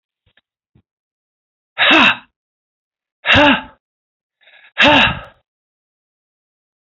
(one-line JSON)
{"exhalation_length": "6.8 s", "exhalation_amplitude": 31440, "exhalation_signal_mean_std_ratio": 0.33, "survey_phase": "alpha (2021-03-01 to 2021-08-12)", "age": "65+", "gender": "Male", "wearing_mask": "No", "symptom_none": true, "smoker_status": "Never smoked", "respiratory_condition_asthma": false, "respiratory_condition_other": false, "recruitment_source": "REACT", "submission_delay": "8 days", "covid_test_result": "Negative", "covid_test_method": "RT-qPCR"}